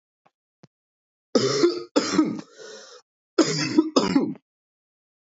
{
  "cough_length": "5.3 s",
  "cough_amplitude": 20281,
  "cough_signal_mean_std_ratio": 0.44,
  "survey_phase": "beta (2021-08-13 to 2022-03-07)",
  "age": "18-44",
  "gender": "Male",
  "wearing_mask": "No",
  "symptom_cough_any": true,
  "symptom_new_continuous_cough": true,
  "symptom_runny_or_blocked_nose": true,
  "symptom_sore_throat": true,
  "symptom_abdominal_pain": true,
  "symptom_fatigue": true,
  "symptom_headache": true,
  "symptom_change_to_sense_of_smell_or_taste": true,
  "symptom_loss_of_taste": true,
  "smoker_status": "Never smoked",
  "respiratory_condition_asthma": false,
  "respiratory_condition_other": false,
  "recruitment_source": "Test and Trace",
  "submission_delay": "1 day",
  "covid_test_result": "Positive",
  "covid_test_method": "RT-qPCR",
  "covid_ct_value": 17.4,
  "covid_ct_gene": "N gene",
  "covid_ct_mean": 18.2,
  "covid_viral_load": "1100000 copies/ml",
  "covid_viral_load_category": "High viral load (>1M copies/ml)"
}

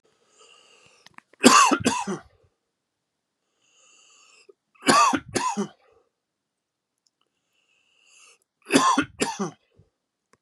{
  "three_cough_length": "10.4 s",
  "three_cough_amplitude": 32767,
  "three_cough_signal_mean_std_ratio": 0.31,
  "survey_phase": "beta (2021-08-13 to 2022-03-07)",
  "age": "45-64",
  "gender": "Male",
  "wearing_mask": "No",
  "symptom_cough_any": true,
  "symptom_runny_or_blocked_nose": true,
  "symptom_shortness_of_breath": true,
  "symptom_fatigue": true,
  "symptom_headache": true,
  "symptom_onset": "4 days",
  "smoker_status": "Ex-smoker",
  "respiratory_condition_asthma": false,
  "respiratory_condition_other": false,
  "recruitment_source": "Test and Trace",
  "submission_delay": "2 days",
  "covid_test_result": "Positive",
  "covid_test_method": "RT-qPCR",
  "covid_ct_value": 18.3,
  "covid_ct_gene": "N gene",
  "covid_ct_mean": 18.6,
  "covid_viral_load": "820000 copies/ml",
  "covid_viral_load_category": "Low viral load (10K-1M copies/ml)"
}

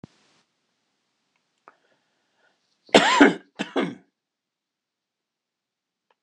{
  "cough_length": "6.2 s",
  "cough_amplitude": 26028,
  "cough_signal_mean_std_ratio": 0.22,
  "survey_phase": "beta (2021-08-13 to 2022-03-07)",
  "age": "45-64",
  "gender": "Male",
  "wearing_mask": "No",
  "symptom_none": true,
  "smoker_status": "Never smoked",
  "respiratory_condition_asthma": false,
  "respiratory_condition_other": false,
  "recruitment_source": "REACT",
  "submission_delay": "1 day",
  "covid_test_result": "Negative",
  "covid_test_method": "RT-qPCR"
}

